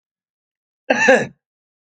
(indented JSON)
{
  "three_cough_length": "1.9 s",
  "three_cough_amplitude": 27767,
  "three_cough_signal_mean_std_ratio": 0.34,
  "survey_phase": "alpha (2021-03-01 to 2021-08-12)",
  "age": "65+",
  "gender": "Male",
  "wearing_mask": "No",
  "symptom_none": true,
  "symptom_shortness_of_breath": true,
  "symptom_headache": true,
  "smoker_status": "Never smoked",
  "respiratory_condition_asthma": true,
  "respiratory_condition_other": false,
  "recruitment_source": "REACT",
  "submission_delay": "2 days",
  "covid_test_result": "Negative",
  "covid_test_method": "RT-qPCR"
}